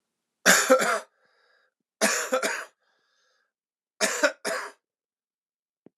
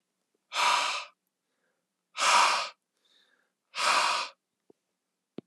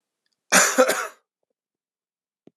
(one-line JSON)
{"three_cough_length": "6.0 s", "three_cough_amplitude": 29218, "three_cough_signal_mean_std_ratio": 0.37, "exhalation_length": "5.5 s", "exhalation_amplitude": 11606, "exhalation_signal_mean_std_ratio": 0.42, "cough_length": "2.6 s", "cough_amplitude": 27970, "cough_signal_mean_std_ratio": 0.32, "survey_phase": "alpha (2021-03-01 to 2021-08-12)", "age": "45-64", "gender": "Male", "wearing_mask": "No", "symptom_cough_any": true, "symptom_fatigue": true, "symptom_headache": true, "symptom_change_to_sense_of_smell_or_taste": true, "symptom_loss_of_taste": true, "symptom_onset": "5 days", "smoker_status": "Never smoked", "respiratory_condition_asthma": false, "respiratory_condition_other": false, "recruitment_source": "Test and Trace", "submission_delay": "2 days", "covid_test_result": "Positive", "covid_test_method": "RT-qPCR", "covid_ct_value": 19.2, "covid_ct_gene": "N gene", "covid_ct_mean": 19.8, "covid_viral_load": "320000 copies/ml", "covid_viral_load_category": "Low viral load (10K-1M copies/ml)"}